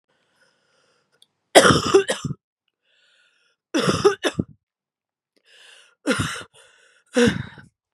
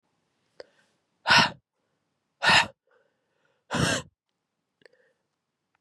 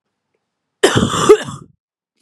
{"three_cough_length": "7.9 s", "three_cough_amplitude": 32768, "three_cough_signal_mean_std_ratio": 0.32, "exhalation_length": "5.8 s", "exhalation_amplitude": 17303, "exhalation_signal_mean_std_ratio": 0.27, "cough_length": "2.2 s", "cough_amplitude": 32768, "cough_signal_mean_std_ratio": 0.37, "survey_phase": "beta (2021-08-13 to 2022-03-07)", "age": "18-44", "gender": "Female", "wearing_mask": "No", "symptom_cough_any": true, "symptom_new_continuous_cough": true, "symptom_runny_or_blocked_nose": true, "symptom_shortness_of_breath": true, "symptom_sore_throat": true, "symptom_abdominal_pain": true, "symptom_fatigue": true, "symptom_headache": true, "symptom_onset": "10 days", "smoker_status": "Ex-smoker", "respiratory_condition_asthma": false, "respiratory_condition_other": false, "recruitment_source": "Test and Trace", "submission_delay": "2 days", "covid_test_result": "Positive", "covid_test_method": "RT-qPCR", "covid_ct_value": 28.3, "covid_ct_gene": "N gene"}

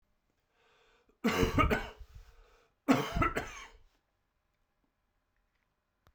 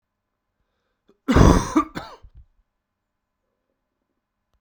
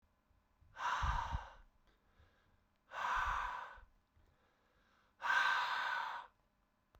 {"three_cough_length": "6.1 s", "three_cough_amplitude": 8491, "three_cough_signal_mean_std_ratio": 0.34, "cough_length": "4.6 s", "cough_amplitude": 32767, "cough_signal_mean_std_ratio": 0.25, "exhalation_length": "7.0 s", "exhalation_amplitude": 2588, "exhalation_signal_mean_std_ratio": 0.5, "survey_phase": "beta (2021-08-13 to 2022-03-07)", "age": "45-64", "gender": "Male", "wearing_mask": "No", "symptom_cough_any": true, "symptom_runny_or_blocked_nose": true, "symptom_sore_throat": true, "symptom_headache": true, "symptom_onset": "2 days", "smoker_status": "Ex-smoker", "respiratory_condition_asthma": false, "respiratory_condition_other": false, "recruitment_source": "Test and Trace", "submission_delay": "1 day", "covid_test_result": "Positive", "covid_test_method": "RT-qPCR", "covid_ct_value": 20.7, "covid_ct_gene": "ORF1ab gene", "covid_ct_mean": 21.5, "covid_viral_load": "87000 copies/ml", "covid_viral_load_category": "Low viral load (10K-1M copies/ml)"}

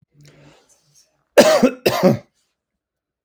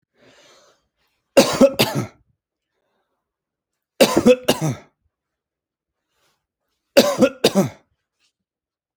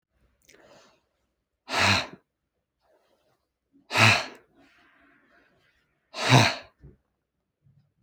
{"cough_length": "3.2 s", "cough_amplitude": 31763, "cough_signal_mean_std_ratio": 0.34, "three_cough_length": "9.0 s", "three_cough_amplitude": 30274, "three_cough_signal_mean_std_ratio": 0.3, "exhalation_length": "8.0 s", "exhalation_amplitude": 24245, "exhalation_signal_mean_std_ratio": 0.27, "survey_phase": "alpha (2021-03-01 to 2021-08-12)", "age": "18-44", "gender": "Male", "wearing_mask": "No", "symptom_none": true, "smoker_status": "Never smoked", "respiratory_condition_asthma": false, "respiratory_condition_other": false, "recruitment_source": "REACT", "submission_delay": "1 day", "covid_test_result": "Negative", "covid_test_method": "RT-qPCR"}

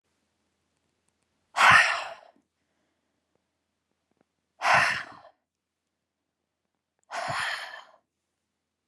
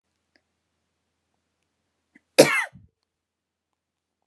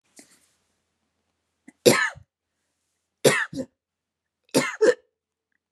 {"exhalation_length": "8.9 s", "exhalation_amplitude": 18415, "exhalation_signal_mean_std_ratio": 0.27, "cough_length": "4.3 s", "cough_amplitude": 32402, "cough_signal_mean_std_ratio": 0.15, "three_cough_length": "5.7 s", "three_cough_amplitude": 29393, "three_cough_signal_mean_std_ratio": 0.27, "survey_phase": "beta (2021-08-13 to 2022-03-07)", "age": "18-44", "gender": "Female", "wearing_mask": "No", "symptom_runny_or_blocked_nose": true, "symptom_sore_throat": true, "symptom_onset": "12 days", "smoker_status": "Never smoked", "respiratory_condition_asthma": false, "respiratory_condition_other": false, "recruitment_source": "REACT", "submission_delay": "1 day", "covid_test_result": "Negative", "covid_test_method": "RT-qPCR"}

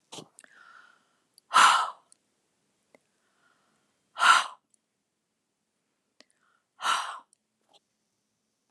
{"exhalation_length": "8.7 s", "exhalation_amplitude": 15798, "exhalation_signal_mean_std_ratio": 0.24, "survey_phase": "beta (2021-08-13 to 2022-03-07)", "age": "65+", "gender": "Female", "wearing_mask": "No", "symptom_none": true, "smoker_status": "Never smoked", "respiratory_condition_asthma": false, "respiratory_condition_other": false, "recruitment_source": "REACT", "submission_delay": "1 day", "covid_test_result": "Negative", "covid_test_method": "RT-qPCR"}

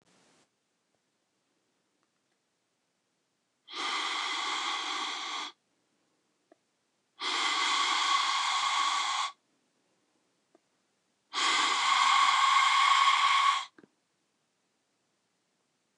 {"exhalation_length": "16.0 s", "exhalation_amplitude": 8534, "exhalation_signal_mean_std_ratio": 0.52, "survey_phase": "beta (2021-08-13 to 2022-03-07)", "age": "45-64", "gender": "Female", "wearing_mask": "No", "symptom_none": true, "smoker_status": "Never smoked", "respiratory_condition_asthma": false, "respiratory_condition_other": false, "recruitment_source": "REACT", "submission_delay": "3 days", "covid_test_result": "Negative", "covid_test_method": "RT-qPCR", "influenza_a_test_result": "Negative", "influenza_b_test_result": "Negative"}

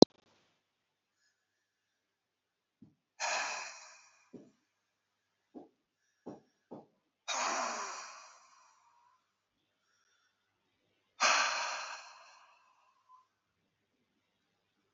{"exhalation_length": "14.9 s", "exhalation_amplitude": 29426, "exhalation_signal_mean_std_ratio": 0.22, "survey_phase": "alpha (2021-03-01 to 2021-08-12)", "age": "65+", "gender": "Male", "wearing_mask": "No", "symptom_none": true, "smoker_status": "Ex-smoker", "respiratory_condition_asthma": true, "respiratory_condition_other": true, "recruitment_source": "REACT", "submission_delay": "5 days", "covid_test_result": "Negative", "covid_test_method": "RT-qPCR"}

